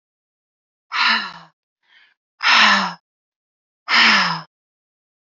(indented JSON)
{
  "exhalation_length": "5.3 s",
  "exhalation_amplitude": 27195,
  "exhalation_signal_mean_std_ratio": 0.4,
  "survey_phase": "alpha (2021-03-01 to 2021-08-12)",
  "age": "18-44",
  "gender": "Female",
  "wearing_mask": "No",
  "symptom_fatigue": true,
  "symptom_headache": true,
  "smoker_status": "Ex-smoker",
  "respiratory_condition_asthma": false,
  "respiratory_condition_other": false,
  "recruitment_source": "REACT",
  "submission_delay": "1 day",
  "covid_test_result": "Negative",
  "covid_test_method": "RT-qPCR"
}